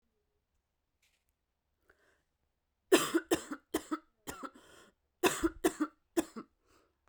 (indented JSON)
{
  "three_cough_length": "7.1 s",
  "three_cough_amplitude": 10226,
  "three_cough_signal_mean_std_ratio": 0.28,
  "survey_phase": "beta (2021-08-13 to 2022-03-07)",
  "age": "18-44",
  "gender": "Female",
  "wearing_mask": "No",
  "symptom_cough_any": true,
  "symptom_new_continuous_cough": true,
  "symptom_runny_or_blocked_nose": true,
  "symptom_fatigue": true,
  "symptom_fever_high_temperature": true,
  "symptom_headache": true,
  "symptom_change_to_sense_of_smell_or_taste": true,
  "symptom_loss_of_taste": true,
  "smoker_status": "Never smoked",
  "respiratory_condition_asthma": false,
  "respiratory_condition_other": false,
  "recruitment_source": "Test and Trace",
  "submission_delay": "1 day",
  "covid_test_result": "Positive",
  "covid_test_method": "LFT"
}